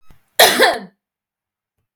{"cough_length": "2.0 s", "cough_amplitude": 32768, "cough_signal_mean_std_ratio": 0.35, "survey_phase": "beta (2021-08-13 to 2022-03-07)", "age": "18-44", "gender": "Female", "wearing_mask": "No", "symptom_none": true, "smoker_status": "Never smoked", "respiratory_condition_asthma": true, "respiratory_condition_other": false, "recruitment_source": "REACT", "submission_delay": "5 days", "covid_test_result": "Negative", "covid_test_method": "RT-qPCR"}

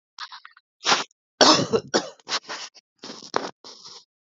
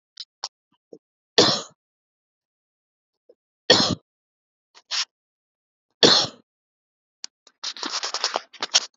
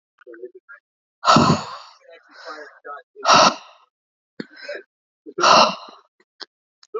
{"cough_length": "4.3 s", "cough_amplitude": 28577, "cough_signal_mean_std_ratio": 0.34, "three_cough_length": "9.0 s", "three_cough_amplitude": 32767, "three_cough_signal_mean_std_ratio": 0.27, "exhalation_length": "7.0 s", "exhalation_amplitude": 30685, "exhalation_signal_mean_std_ratio": 0.34, "survey_phase": "beta (2021-08-13 to 2022-03-07)", "age": "18-44", "gender": "Male", "wearing_mask": "No", "symptom_none": true, "smoker_status": "Ex-smoker", "respiratory_condition_asthma": false, "respiratory_condition_other": false, "recruitment_source": "REACT", "submission_delay": "1 day", "covid_test_result": "Negative", "covid_test_method": "RT-qPCR", "influenza_a_test_result": "Negative", "influenza_b_test_result": "Negative"}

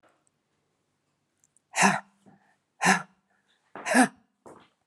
{"exhalation_length": "4.9 s", "exhalation_amplitude": 19823, "exhalation_signal_mean_std_ratio": 0.28, "survey_phase": "beta (2021-08-13 to 2022-03-07)", "age": "45-64", "gender": "Female", "wearing_mask": "No", "symptom_new_continuous_cough": true, "smoker_status": "Ex-smoker", "respiratory_condition_asthma": false, "respiratory_condition_other": false, "recruitment_source": "Test and Trace", "submission_delay": "2 days", "covid_test_result": "Positive", "covid_test_method": "RT-qPCR", "covid_ct_value": 21.6, "covid_ct_gene": "ORF1ab gene"}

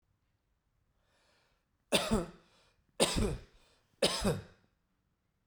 {"three_cough_length": "5.5 s", "three_cough_amplitude": 8050, "three_cough_signal_mean_std_ratio": 0.35, "survey_phase": "beta (2021-08-13 to 2022-03-07)", "age": "45-64", "gender": "Male", "wearing_mask": "No", "symptom_none": true, "smoker_status": "Never smoked", "respiratory_condition_asthma": false, "respiratory_condition_other": false, "recruitment_source": "REACT", "submission_delay": "2 days", "covid_test_result": "Negative", "covid_test_method": "RT-qPCR"}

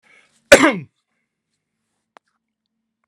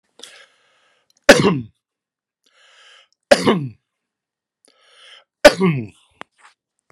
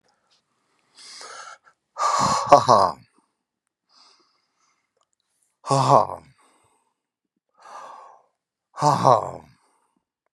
{"cough_length": "3.1 s", "cough_amplitude": 32768, "cough_signal_mean_std_ratio": 0.2, "three_cough_length": "6.9 s", "three_cough_amplitude": 32768, "three_cough_signal_mean_std_ratio": 0.25, "exhalation_length": "10.3 s", "exhalation_amplitude": 32768, "exhalation_signal_mean_std_ratio": 0.29, "survey_phase": "beta (2021-08-13 to 2022-03-07)", "age": "65+", "gender": "Male", "wearing_mask": "No", "symptom_none": true, "smoker_status": "Never smoked", "respiratory_condition_asthma": false, "respiratory_condition_other": false, "recruitment_source": "REACT", "submission_delay": "3 days", "covid_test_result": "Negative", "covid_test_method": "RT-qPCR"}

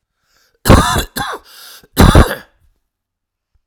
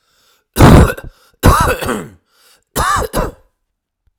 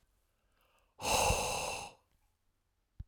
{"cough_length": "3.7 s", "cough_amplitude": 32768, "cough_signal_mean_std_ratio": 0.37, "three_cough_length": "4.2 s", "three_cough_amplitude": 32768, "three_cough_signal_mean_std_ratio": 0.43, "exhalation_length": "3.1 s", "exhalation_amplitude": 4536, "exhalation_signal_mean_std_ratio": 0.42, "survey_phase": "alpha (2021-03-01 to 2021-08-12)", "age": "45-64", "gender": "Male", "wearing_mask": "No", "symptom_cough_any": true, "symptom_fatigue": true, "symptom_headache": true, "smoker_status": "Ex-smoker", "respiratory_condition_asthma": false, "respiratory_condition_other": false, "recruitment_source": "REACT", "submission_delay": "1 day", "covid_test_result": "Positive", "covid_test_method": "RT-qPCR", "covid_ct_value": 36.0, "covid_ct_gene": "N gene"}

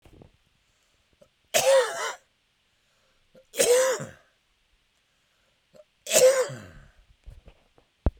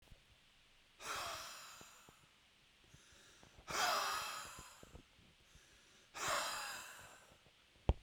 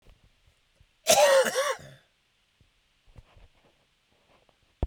{"three_cough_length": "8.2 s", "three_cough_amplitude": 21804, "three_cough_signal_mean_std_ratio": 0.34, "exhalation_length": "8.0 s", "exhalation_amplitude": 4890, "exhalation_signal_mean_std_ratio": 0.45, "cough_length": "4.9 s", "cough_amplitude": 14587, "cough_signal_mean_std_ratio": 0.3, "survey_phase": "beta (2021-08-13 to 2022-03-07)", "age": "65+", "gender": "Male", "wearing_mask": "No", "symptom_cough_any": true, "symptom_runny_or_blocked_nose": true, "symptom_fatigue": true, "symptom_onset": "3 days", "smoker_status": "Never smoked", "respiratory_condition_asthma": false, "respiratory_condition_other": false, "recruitment_source": "Test and Trace", "submission_delay": "1 day", "covid_test_result": "Positive", "covid_test_method": "RT-qPCR", "covid_ct_value": 14.0, "covid_ct_gene": "ORF1ab gene", "covid_ct_mean": 14.2, "covid_viral_load": "22000000 copies/ml", "covid_viral_load_category": "High viral load (>1M copies/ml)"}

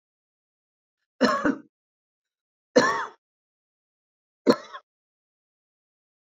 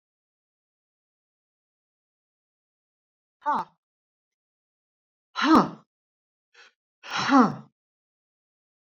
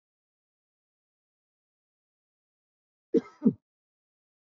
{"three_cough_length": "6.2 s", "three_cough_amplitude": 21277, "three_cough_signal_mean_std_ratio": 0.25, "exhalation_length": "8.9 s", "exhalation_amplitude": 23131, "exhalation_signal_mean_std_ratio": 0.22, "cough_length": "4.4 s", "cough_amplitude": 10174, "cough_signal_mean_std_ratio": 0.14, "survey_phase": "beta (2021-08-13 to 2022-03-07)", "age": "65+", "gender": "Female", "wearing_mask": "No", "symptom_none": true, "smoker_status": "Ex-smoker", "respiratory_condition_asthma": false, "respiratory_condition_other": false, "recruitment_source": "REACT", "submission_delay": "3 days", "covid_test_result": "Negative", "covid_test_method": "RT-qPCR", "influenza_a_test_result": "Negative", "influenza_b_test_result": "Negative"}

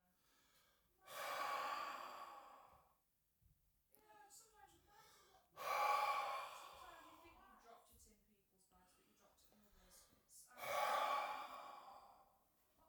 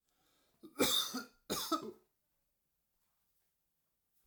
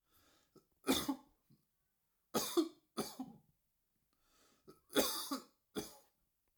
{"exhalation_length": "12.9 s", "exhalation_amplitude": 1403, "exhalation_signal_mean_std_ratio": 0.45, "cough_length": "4.3 s", "cough_amplitude": 4071, "cough_signal_mean_std_ratio": 0.33, "three_cough_length": "6.6 s", "three_cough_amplitude": 4778, "three_cough_signal_mean_std_ratio": 0.33, "survey_phase": "alpha (2021-03-01 to 2021-08-12)", "age": "18-44", "gender": "Male", "wearing_mask": "No", "symptom_none": true, "smoker_status": "Never smoked", "respiratory_condition_asthma": false, "respiratory_condition_other": false, "recruitment_source": "REACT", "submission_delay": "3 days", "covid_test_result": "Negative", "covid_test_method": "RT-qPCR"}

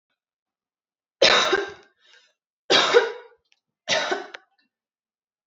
{"three_cough_length": "5.5 s", "three_cough_amplitude": 25597, "three_cough_signal_mean_std_ratio": 0.35, "survey_phase": "alpha (2021-03-01 to 2021-08-12)", "age": "18-44", "gender": "Female", "wearing_mask": "No", "symptom_none": true, "smoker_status": "Never smoked", "respiratory_condition_asthma": false, "respiratory_condition_other": false, "recruitment_source": "REACT", "submission_delay": "1 day", "covid_test_result": "Negative", "covid_test_method": "RT-qPCR"}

